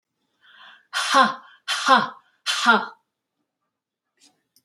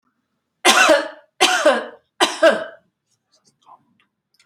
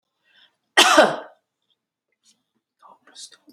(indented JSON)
{
  "exhalation_length": "4.6 s",
  "exhalation_amplitude": 25041,
  "exhalation_signal_mean_std_ratio": 0.37,
  "three_cough_length": "4.5 s",
  "three_cough_amplitude": 32493,
  "three_cough_signal_mean_std_ratio": 0.4,
  "cough_length": "3.5 s",
  "cough_amplitude": 31582,
  "cough_signal_mean_std_ratio": 0.26,
  "survey_phase": "beta (2021-08-13 to 2022-03-07)",
  "age": "65+",
  "gender": "Female",
  "wearing_mask": "No",
  "symptom_none": true,
  "smoker_status": "Never smoked",
  "respiratory_condition_asthma": false,
  "respiratory_condition_other": false,
  "recruitment_source": "REACT",
  "submission_delay": "1 day",
  "covid_test_result": "Negative",
  "covid_test_method": "RT-qPCR"
}